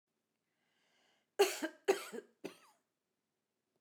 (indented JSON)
{
  "cough_length": "3.8 s",
  "cough_amplitude": 4613,
  "cough_signal_mean_std_ratio": 0.24,
  "survey_phase": "beta (2021-08-13 to 2022-03-07)",
  "age": "65+",
  "gender": "Female",
  "wearing_mask": "No",
  "symptom_none": true,
  "smoker_status": "Never smoked",
  "respiratory_condition_asthma": false,
  "respiratory_condition_other": false,
  "recruitment_source": "REACT",
  "submission_delay": "1 day",
  "covid_test_result": "Negative",
  "covid_test_method": "RT-qPCR"
}